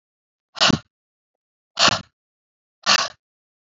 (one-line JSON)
{"exhalation_length": "3.8 s", "exhalation_amplitude": 31652, "exhalation_signal_mean_std_ratio": 0.29, "survey_phase": "beta (2021-08-13 to 2022-03-07)", "age": "45-64", "gender": "Female", "wearing_mask": "No", "symptom_abdominal_pain": true, "symptom_headache": true, "symptom_onset": "11 days", "smoker_status": "Current smoker (e-cigarettes or vapes only)", "respiratory_condition_asthma": false, "respiratory_condition_other": false, "recruitment_source": "REACT", "submission_delay": "1 day", "covid_test_result": "Negative", "covid_test_method": "RT-qPCR", "influenza_a_test_result": "Unknown/Void", "influenza_b_test_result": "Unknown/Void"}